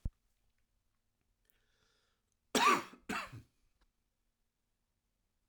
{"cough_length": "5.5 s", "cough_amplitude": 5167, "cough_signal_mean_std_ratio": 0.22, "survey_phase": "alpha (2021-03-01 to 2021-08-12)", "age": "45-64", "gender": "Male", "wearing_mask": "No", "symptom_new_continuous_cough": true, "symptom_shortness_of_breath": true, "symptom_onset": "6 days", "smoker_status": "Current smoker (e-cigarettes or vapes only)", "respiratory_condition_asthma": false, "respiratory_condition_other": false, "recruitment_source": "Test and Trace", "submission_delay": "2 days", "covid_test_result": "Positive", "covid_test_method": "RT-qPCR", "covid_ct_value": 15.8, "covid_ct_gene": "ORF1ab gene", "covid_ct_mean": 16.1, "covid_viral_load": "5300000 copies/ml", "covid_viral_load_category": "High viral load (>1M copies/ml)"}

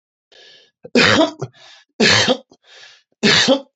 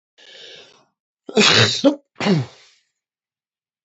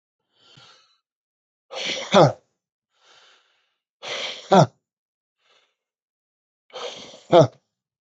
{"three_cough_length": "3.8 s", "three_cough_amplitude": 30085, "three_cough_signal_mean_std_ratio": 0.47, "cough_length": "3.8 s", "cough_amplitude": 30174, "cough_signal_mean_std_ratio": 0.37, "exhalation_length": "8.0 s", "exhalation_amplitude": 28185, "exhalation_signal_mean_std_ratio": 0.24, "survey_phase": "beta (2021-08-13 to 2022-03-07)", "age": "45-64", "gender": "Male", "wearing_mask": "No", "symptom_cough_any": true, "symptom_runny_or_blocked_nose": true, "symptom_fatigue": true, "symptom_onset": "4 days", "smoker_status": "Ex-smoker", "respiratory_condition_asthma": false, "respiratory_condition_other": false, "recruitment_source": "Test and Trace", "submission_delay": "1 day", "covid_test_result": "Positive", "covid_test_method": "RT-qPCR"}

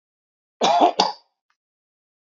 {"cough_length": "2.2 s", "cough_amplitude": 26643, "cough_signal_mean_std_ratio": 0.35, "survey_phase": "beta (2021-08-13 to 2022-03-07)", "age": "45-64", "gender": "Male", "wearing_mask": "No", "symptom_none": true, "smoker_status": "Never smoked", "respiratory_condition_asthma": false, "respiratory_condition_other": false, "recruitment_source": "REACT", "submission_delay": "2 days", "covid_test_result": "Negative", "covid_test_method": "RT-qPCR", "influenza_a_test_result": "Negative", "influenza_b_test_result": "Negative"}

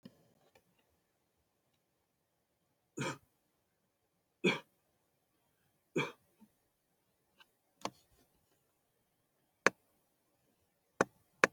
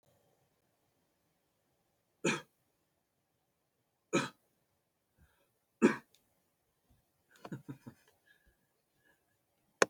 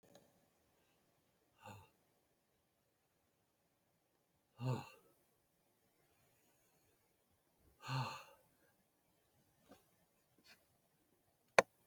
{"three_cough_length": "11.5 s", "three_cough_amplitude": 14398, "three_cough_signal_mean_std_ratio": 0.14, "cough_length": "9.9 s", "cough_amplitude": 12527, "cough_signal_mean_std_ratio": 0.16, "exhalation_length": "11.9 s", "exhalation_amplitude": 9112, "exhalation_signal_mean_std_ratio": 0.15, "survey_phase": "alpha (2021-03-01 to 2021-08-12)", "age": "65+", "gender": "Male", "wearing_mask": "No", "symptom_none": true, "symptom_onset": "12 days", "smoker_status": "Ex-smoker", "respiratory_condition_asthma": false, "respiratory_condition_other": false, "recruitment_source": "REACT", "submission_delay": "1 day", "covid_test_result": "Negative", "covid_test_method": "RT-qPCR"}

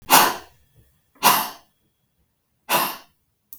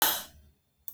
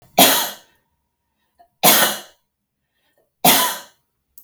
{"exhalation_length": "3.6 s", "exhalation_amplitude": 32766, "exhalation_signal_mean_std_ratio": 0.34, "cough_length": "0.9 s", "cough_amplitude": 11963, "cough_signal_mean_std_ratio": 0.38, "three_cough_length": "4.4 s", "three_cough_amplitude": 32768, "three_cough_signal_mean_std_ratio": 0.36, "survey_phase": "beta (2021-08-13 to 2022-03-07)", "age": "45-64", "gender": "Female", "wearing_mask": "No", "symptom_runny_or_blocked_nose": true, "smoker_status": "Never smoked", "respiratory_condition_asthma": false, "respiratory_condition_other": false, "recruitment_source": "REACT", "submission_delay": "1 day", "covid_test_result": "Negative", "covid_test_method": "RT-qPCR", "influenza_a_test_result": "Negative", "influenza_b_test_result": "Negative"}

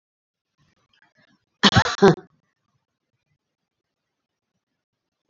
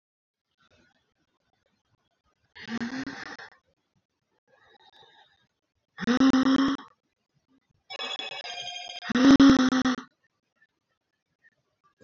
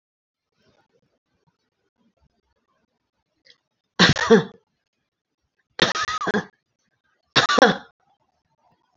{"cough_length": "5.3 s", "cough_amplitude": 29357, "cough_signal_mean_std_ratio": 0.2, "exhalation_length": "12.0 s", "exhalation_amplitude": 14426, "exhalation_signal_mean_std_ratio": 0.33, "three_cough_length": "9.0 s", "three_cough_amplitude": 28435, "three_cough_signal_mean_std_ratio": 0.26, "survey_phase": "beta (2021-08-13 to 2022-03-07)", "age": "65+", "gender": "Female", "wearing_mask": "No", "symptom_none": true, "smoker_status": "Never smoked", "respiratory_condition_asthma": false, "respiratory_condition_other": false, "recruitment_source": "REACT", "submission_delay": "2 days", "covid_test_result": "Negative", "covid_test_method": "RT-qPCR"}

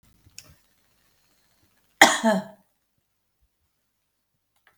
{"cough_length": "4.8 s", "cough_amplitude": 32768, "cough_signal_mean_std_ratio": 0.19, "survey_phase": "beta (2021-08-13 to 2022-03-07)", "age": "65+", "gender": "Female", "wearing_mask": "No", "symptom_none": true, "smoker_status": "Current smoker (e-cigarettes or vapes only)", "respiratory_condition_asthma": false, "respiratory_condition_other": true, "recruitment_source": "REACT", "submission_delay": "1 day", "covid_test_result": "Negative", "covid_test_method": "RT-qPCR"}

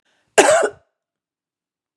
{"cough_length": "2.0 s", "cough_amplitude": 32768, "cough_signal_mean_std_ratio": 0.31, "survey_phase": "beta (2021-08-13 to 2022-03-07)", "age": "45-64", "gender": "Female", "wearing_mask": "No", "symptom_cough_any": true, "symptom_onset": "12 days", "smoker_status": "Current smoker (e-cigarettes or vapes only)", "respiratory_condition_asthma": true, "respiratory_condition_other": false, "recruitment_source": "REACT", "submission_delay": "7 days", "covid_test_result": "Negative", "covid_test_method": "RT-qPCR", "influenza_a_test_result": "Negative", "influenza_b_test_result": "Negative"}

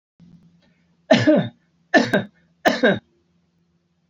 {"three_cough_length": "4.1 s", "three_cough_amplitude": 26527, "three_cough_signal_mean_std_ratio": 0.36, "survey_phase": "alpha (2021-03-01 to 2021-08-12)", "age": "45-64", "gender": "Male", "wearing_mask": "No", "symptom_none": true, "smoker_status": "Never smoked", "respiratory_condition_asthma": false, "respiratory_condition_other": false, "recruitment_source": "REACT", "submission_delay": "1 day", "covid_test_result": "Negative", "covid_test_method": "RT-qPCR"}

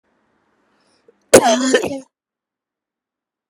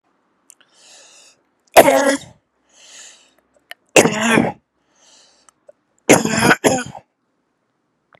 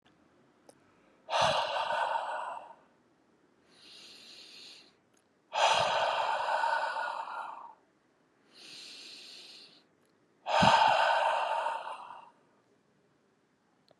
{"cough_length": "3.5 s", "cough_amplitude": 32768, "cough_signal_mean_std_ratio": 0.29, "three_cough_length": "8.2 s", "three_cough_amplitude": 32768, "three_cough_signal_mean_std_ratio": 0.32, "exhalation_length": "14.0 s", "exhalation_amplitude": 9662, "exhalation_signal_mean_std_ratio": 0.49, "survey_phase": "beta (2021-08-13 to 2022-03-07)", "age": "45-64", "gender": "Male", "wearing_mask": "No", "symptom_none": true, "smoker_status": "Current smoker (1 to 10 cigarettes per day)", "respiratory_condition_asthma": false, "respiratory_condition_other": false, "recruitment_source": "Test and Trace", "submission_delay": "-1 day", "covid_test_result": "Negative", "covid_test_method": "LFT"}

